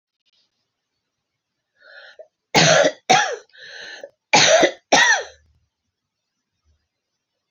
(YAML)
cough_length: 7.5 s
cough_amplitude: 30671
cough_signal_mean_std_ratio: 0.35
survey_phase: beta (2021-08-13 to 2022-03-07)
age: 45-64
gender: Female
wearing_mask: 'No'
symptom_cough_any: true
symptom_runny_or_blocked_nose: true
symptom_diarrhoea: true
symptom_fatigue: true
symptom_headache: true
symptom_change_to_sense_of_smell_or_taste: true
symptom_loss_of_taste: true
symptom_onset: 5 days
smoker_status: Ex-smoker
respiratory_condition_asthma: false
respiratory_condition_other: false
recruitment_source: Test and Trace
submission_delay: 2 days
covid_test_result: Positive
covid_test_method: RT-qPCR